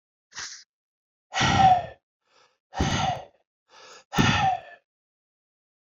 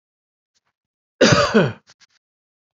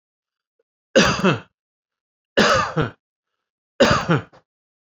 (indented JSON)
{
  "exhalation_length": "5.9 s",
  "exhalation_amplitude": 14459,
  "exhalation_signal_mean_std_ratio": 0.4,
  "cough_length": "2.7 s",
  "cough_amplitude": 28765,
  "cough_signal_mean_std_ratio": 0.33,
  "three_cough_length": "4.9 s",
  "three_cough_amplitude": 27192,
  "three_cough_signal_mean_std_ratio": 0.39,
  "survey_phase": "beta (2021-08-13 to 2022-03-07)",
  "age": "45-64",
  "gender": "Male",
  "wearing_mask": "No",
  "symptom_none": true,
  "smoker_status": "Never smoked",
  "respiratory_condition_asthma": false,
  "respiratory_condition_other": false,
  "recruitment_source": "REACT",
  "submission_delay": "1 day",
  "covid_test_result": "Negative",
  "covid_test_method": "RT-qPCR"
}